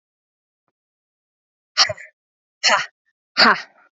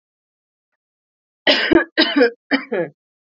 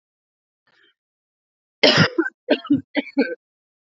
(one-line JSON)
{"exhalation_length": "3.9 s", "exhalation_amplitude": 32768, "exhalation_signal_mean_std_ratio": 0.28, "cough_length": "3.3 s", "cough_amplitude": 32767, "cough_signal_mean_std_ratio": 0.4, "three_cough_length": "3.8 s", "three_cough_amplitude": 30408, "three_cough_signal_mean_std_ratio": 0.34, "survey_phase": "alpha (2021-03-01 to 2021-08-12)", "age": "18-44", "gender": "Female", "wearing_mask": "No", "symptom_cough_any": true, "symptom_headache": true, "symptom_onset": "3 days", "smoker_status": "Never smoked", "respiratory_condition_asthma": false, "respiratory_condition_other": false, "recruitment_source": "Test and Trace", "submission_delay": "2 days", "covid_test_result": "Positive", "covid_test_method": "RT-qPCR", "covid_ct_value": 15.3, "covid_ct_gene": "ORF1ab gene", "covid_ct_mean": 15.5, "covid_viral_load": "8000000 copies/ml", "covid_viral_load_category": "High viral load (>1M copies/ml)"}